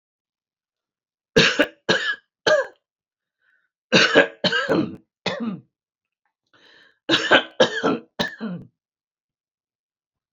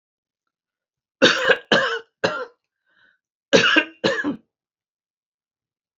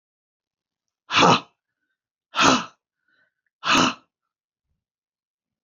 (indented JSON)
{
  "three_cough_length": "10.3 s",
  "three_cough_amplitude": 28794,
  "three_cough_signal_mean_std_ratio": 0.37,
  "cough_length": "6.0 s",
  "cough_amplitude": 27625,
  "cough_signal_mean_std_ratio": 0.36,
  "exhalation_length": "5.6 s",
  "exhalation_amplitude": 27041,
  "exhalation_signal_mean_std_ratio": 0.3,
  "survey_phase": "beta (2021-08-13 to 2022-03-07)",
  "age": "65+",
  "gender": "Female",
  "wearing_mask": "No",
  "symptom_none": true,
  "smoker_status": "Never smoked",
  "respiratory_condition_asthma": false,
  "respiratory_condition_other": false,
  "recruitment_source": "REACT",
  "submission_delay": "1 day",
  "covid_test_result": "Negative",
  "covid_test_method": "RT-qPCR",
  "influenza_a_test_result": "Negative",
  "influenza_b_test_result": "Negative"
}